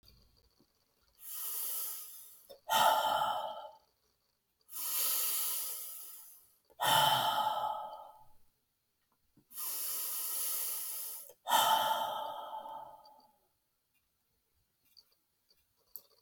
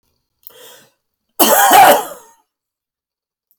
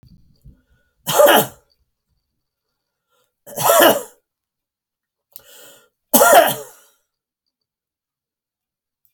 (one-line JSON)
{"exhalation_length": "16.2 s", "exhalation_amplitude": 6214, "exhalation_signal_mean_std_ratio": 0.53, "cough_length": "3.6 s", "cough_amplitude": 32768, "cough_signal_mean_std_ratio": 0.36, "three_cough_length": "9.1 s", "three_cough_amplitude": 32768, "three_cough_signal_mean_std_ratio": 0.29, "survey_phase": "alpha (2021-03-01 to 2021-08-12)", "age": "65+", "gender": "Male", "wearing_mask": "No", "symptom_diarrhoea": true, "smoker_status": "Ex-smoker", "respiratory_condition_asthma": false, "respiratory_condition_other": false, "recruitment_source": "REACT", "submission_delay": "2 days", "covid_test_result": "Negative", "covid_test_method": "RT-qPCR"}